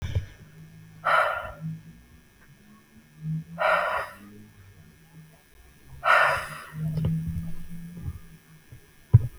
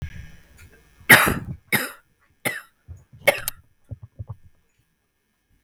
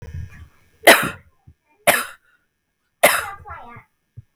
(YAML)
exhalation_length: 9.4 s
exhalation_amplitude: 21812
exhalation_signal_mean_std_ratio: 0.47
cough_length: 5.6 s
cough_amplitude: 32768
cough_signal_mean_std_ratio: 0.27
three_cough_length: 4.4 s
three_cough_amplitude: 32768
three_cough_signal_mean_std_ratio: 0.29
survey_phase: beta (2021-08-13 to 2022-03-07)
age: 18-44
gender: Female
wearing_mask: 'No'
symptom_none: true
smoker_status: Never smoked
respiratory_condition_asthma: false
respiratory_condition_other: false
recruitment_source: REACT
submission_delay: 1 day
covid_test_result: Negative
covid_test_method: RT-qPCR
influenza_a_test_result: Unknown/Void
influenza_b_test_result: Unknown/Void